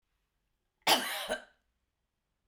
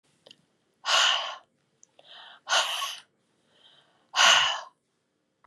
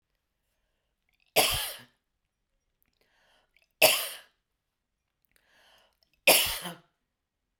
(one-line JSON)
{"cough_length": "2.5 s", "cough_amplitude": 9031, "cough_signal_mean_std_ratio": 0.3, "exhalation_length": "5.5 s", "exhalation_amplitude": 15560, "exhalation_signal_mean_std_ratio": 0.38, "three_cough_length": "7.6 s", "three_cough_amplitude": 17001, "three_cough_signal_mean_std_ratio": 0.25, "survey_phase": "beta (2021-08-13 to 2022-03-07)", "age": "65+", "gender": "Female", "wearing_mask": "No", "symptom_cough_any": true, "symptom_shortness_of_breath": true, "smoker_status": "Never smoked", "respiratory_condition_asthma": true, "respiratory_condition_other": false, "recruitment_source": "REACT", "submission_delay": "2 days", "covid_test_result": "Negative", "covid_test_method": "RT-qPCR", "influenza_a_test_result": "Unknown/Void", "influenza_b_test_result": "Unknown/Void"}